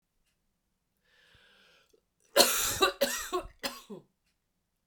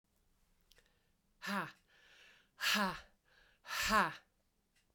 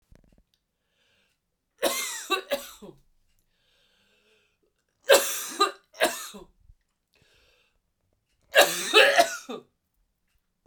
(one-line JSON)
{"cough_length": "4.9 s", "cough_amplitude": 23850, "cough_signal_mean_std_ratio": 0.32, "exhalation_length": "4.9 s", "exhalation_amplitude": 3824, "exhalation_signal_mean_std_ratio": 0.36, "three_cough_length": "10.7 s", "three_cough_amplitude": 25919, "three_cough_signal_mean_std_ratio": 0.3, "survey_phase": "beta (2021-08-13 to 2022-03-07)", "age": "45-64", "gender": "Female", "wearing_mask": "No", "symptom_cough_any": true, "symptom_new_continuous_cough": true, "symptom_runny_or_blocked_nose": true, "symptom_shortness_of_breath": true, "symptom_sore_throat": true, "symptom_abdominal_pain": true, "symptom_diarrhoea": true, "symptom_fatigue": true, "symptom_change_to_sense_of_smell_or_taste": true, "symptom_onset": "7 days", "smoker_status": "Never smoked", "respiratory_condition_asthma": false, "respiratory_condition_other": false, "recruitment_source": "Test and Trace", "submission_delay": "2 days", "covid_test_result": "Positive", "covid_test_method": "RT-qPCR", "covid_ct_value": 12.9, "covid_ct_gene": "S gene", "covid_ct_mean": 13.7, "covid_viral_load": "32000000 copies/ml", "covid_viral_load_category": "High viral load (>1M copies/ml)"}